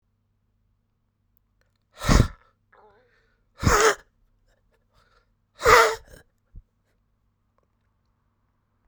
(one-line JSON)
{"exhalation_length": "8.9 s", "exhalation_amplitude": 29324, "exhalation_signal_mean_std_ratio": 0.24, "survey_phase": "beta (2021-08-13 to 2022-03-07)", "age": "18-44", "gender": "Male", "wearing_mask": "No", "symptom_cough_any": true, "symptom_new_continuous_cough": true, "symptom_runny_or_blocked_nose": true, "symptom_shortness_of_breath": true, "symptom_sore_throat": true, "symptom_abdominal_pain": true, "symptom_diarrhoea": true, "symptom_fatigue": true, "symptom_fever_high_temperature": true, "symptom_headache": true, "symptom_change_to_sense_of_smell_or_taste": true, "symptom_loss_of_taste": true, "symptom_onset": "2 days", "smoker_status": "Current smoker (1 to 10 cigarettes per day)", "respiratory_condition_asthma": false, "respiratory_condition_other": false, "recruitment_source": "Test and Trace", "submission_delay": "1 day", "covid_test_result": "Positive", "covid_test_method": "RT-qPCR", "covid_ct_value": 14.9, "covid_ct_gene": "ORF1ab gene", "covid_ct_mean": 15.2, "covid_viral_load": "10000000 copies/ml", "covid_viral_load_category": "High viral load (>1M copies/ml)"}